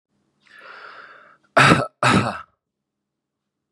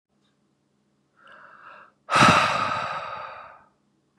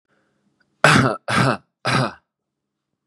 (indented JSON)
{
  "cough_length": "3.7 s",
  "cough_amplitude": 32150,
  "cough_signal_mean_std_ratio": 0.32,
  "exhalation_length": "4.2 s",
  "exhalation_amplitude": 23108,
  "exhalation_signal_mean_std_ratio": 0.37,
  "three_cough_length": "3.1 s",
  "three_cough_amplitude": 32768,
  "three_cough_signal_mean_std_ratio": 0.4,
  "survey_phase": "beta (2021-08-13 to 2022-03-07)",
  "age": "18-44",
  "gender": "Male",
  "wearing_mask": "No",
  "symptom_none": true,
  "symptom_onset": "11 days",
  "smoker_status": "Current smoker (1 to 10 cigarettes per day)",
  "respiratory_condition_asthma": false,
  "respiratory_condition_other": false,
  "recruitment_source": "REACT",
  "submission_delay": "4 days",
  "covid_test_result": "Positive",
  "covid_test_method": "RT-qPCR",
  "covid_ct_value": 32.0,
  "covid_ct_gene": "N gene",
  "influenza_a_test_result": "Negative",
  "influenza_b_test_result": "Negative"
}